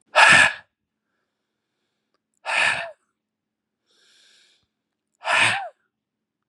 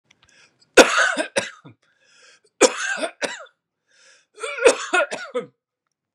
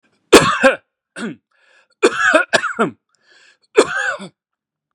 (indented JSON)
{
  "exhalation_length": "6.5 s",
  "exhalation_amplitude": 30029,
  "exhalation_signal_mean_std_ratio": 0.3,
  "three_cough_length": "6.1 s",
  "three_cough_amplitude": 32768,
  "three_cough_signal_mean_std_ratio": 0.34,
  "cough_length": "4.9 s",
  "cough_amplitude": 32768,
  "cough_signal_mean_std_ratio": 0.39,
  "survey_phase": "beta (2021-08-13 to 2022-03-07)",
  "age": "45-64",
  "gender": "Male",
  "wearing_mask": "No",
  "symptom_none": true,
  "smoker_status": "Never smoked",
  "respiratory_condition_asthma": false,
  "respiratory_condition_other": false,
  "recruitment_source": "REACT",
  "submission_delay": "3 days",
  "covid_test_result": "Negative",
  "covid_test_method": "RT-qPCR",
  "influenza_a_test_result": "Unknown/Void",
  "influenza_b_test_result": "Unknown/Void"
}